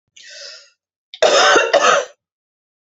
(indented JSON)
{
  "cough_length": "3.0 s",
  "cough_amplitude": 29742,
  "cough_signal_mean_std_ratio": 0.45,
  "survey_phase": "beta (2021-08-13 to 2022-03-07)",
  "age": "45-64",
  "gender": "Female",
  "wearing_mask": "No",
  "symptom_cough_any": true,
  "symptom_runny_or_blocked_nose": true,
  "symptom_sore_throat": true,
  "symptom_fatigue": true,
  "symptom_headache": true,
  "smoker_status": "Never smoked",
  "respiratory_condition_asthma": true,
  "respiratory_condition_other": false,
  "recruitment_source": "Test and Trace",
  "submission_delay": "1 day",
  "covid_test_result": "Positive",
  "covid_test_method": "LFT"
}